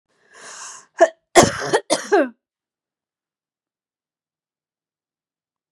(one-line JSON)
{"cough_length": "5.7 s", "cough_amplitude": 32767, "cough_signal_mean_std_ratio": 0.26, "survey_phase": "beta (2021-08-13 to 2022-03-07)", "age": "18-44", "gender": "Female", "wearing_mask": "No", "symptom_headache": true, "symptom_onset": "12 days", "smoker_status": "Never smoked", "respiratory_condition_asthma": true, "respiratory_condition_other": false, "recruitment_source": "REACT", "submission_delay": "1 day", "covid_test_result": "Negative", "covid_test_method": "RT-qPCR", "influenza_a_test_result": "Negative", "influenza_b_test_result": "Negative"}